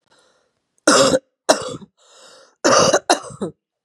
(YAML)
three_cough_length: 3.8 s
three_cough_amplitude: 32768
three_cough_signal_mean_std_ratio: 0.41
survey_phase: beta (2021-08-13 to 2022-03-07)
age: 45-64
gender: Female
wearing_mask: 'No'
symptom_runny_or_blocked_nose: true
symptom_onset: 3 days
smoker_status: Never smoked
respiratory_condition_asthma: false
respiratory_condition_other: false
recruitment_source: Test and Trace
submission_delay: 2 days
covid_test_result: Positive
covid_test_method: RT-qPCR
covid_ct_value: 19.1
covid_ct_gene: ORF1ab gene
covid_ct_mean: 19.6
covid_viral_load: 380000 copies/ml
covid_viral_load_category: Low viral load (10K-1M copies/ml)